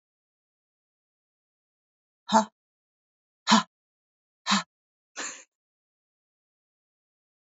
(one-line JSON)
{"exhalation_length": "7.4 s", "exhalation_amplitude": 17297, "exhalation_signal_mean_std_ratio": 0.19, "survey_phase": "beta (2021-08-13 to 2022-03-07)", "age": "65+", "gender": "Female", "wearing_mask": "No", "symptom_none": true, "smoker_status": "Ex-smoker", "respiratory_condition_asthma": false, "respiratory_condition_other": false, "recruitment_source": "REACT", "submission_delay": "2 days", "covid_test_result": "Negative", "covid_test_method": "RT-qPCR", "influenza_a_test_result": "Negative", "influenza_b_test_result": "Negative"}